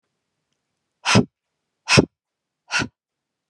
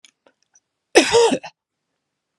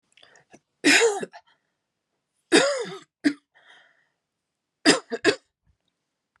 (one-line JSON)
{"exhalation_length": "3.5 s", "exhalation_amplitude": 31854, "exhalation_signal_mean_std_ratio": 0.26, "cough_length": "2.4 s", "cough_amplitude": 32768, "cough_signal_mean_std_ratio": 0.32, "three_cough_length": "6.4 s", "three_cough_amplitude": 27018, "three_cough_signal_mean_std_ratio": 0.32, "survey_phase": "beta (2021-08-13 to 2022-03-07)", "age": "45-64", "gender": "Female", "wearing_mask": "No", "symptom_none": true, "smoker_status": "Ex-smoker", "respiratory_condition_asthma": false, "respiratory_condition_other": false, "recruitment_source": "REACT", "submission_delay": "2 days", "covid_test_result": "Negative", "covid_test_method": "RT-qPCR"}